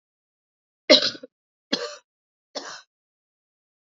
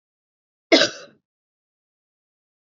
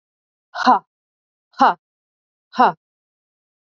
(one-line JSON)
{"three_cough_length": "3.8 s", "three_cough_amplitude": 28613, "three_cough_signal_mean_std_ratio": 0.21, "cough_length": "2.7 s", "cough_amplitude": 28216, "cough_signal_mean_std_ratio": 0.19, "exhalation_length": "3.7 s", "exhalation_amplitude": 27531, "exhalation_signal_mean_std_ratio": 0.26, "survey_phase": "beta (2021-08-13 to 2022-03-07)", "age": "45-64", "gender": "Female", "wearing_mask": "No", "symptom_runny_or_blocked_nose": true, "symptom_shortness_of_breath": true, "symptom_sore_throat": true, "symptom_fatigue": true, "symptom_headache": true, "symptom_change_to_sense_of_smell_or_taste": true, "symptom_loss_of_taste": true, "smoker_status": "Never smoked", "respiratory_condition_asthma": false, "respiratory_condition_other": false, "recruitment_source": "Test and Trace", "submission_delay": "1 day", "covid_test_result": "Positive", "covid_test_method": "ePCR"}